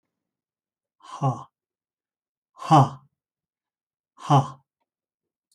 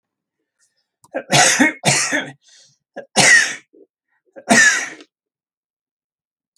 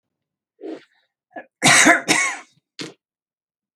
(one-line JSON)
{"exhalation_length": "5.5 s", "exhalation_amplitude": 22513, "exhalation_signal_mean_std_ratio": 0.24, "three_cough_length": "6.6 s", "three_cough_amplitude": 32768, "three_cough_signal_mean_std_ratio": 0.39, "cough_length": "3.8 s", "cough_amplitude": 32723, "cough_signal_mean_std_ratio": 0.34, "survey_phase": "alpha (2021-03-01 to 2021-08-12)", "age": "45-64", "gender": "Male", "wearing_mask": "No", "symptom_none": true, "smoker_status": "Never smoked", "respiratory_condition_asthma": false, "respiratory_condition_other": false, "recruitment_source": "REACT", "submission_delay": "0 days", "covid_test_result": "Negative", "covid_test_method": "RT-qPCR"}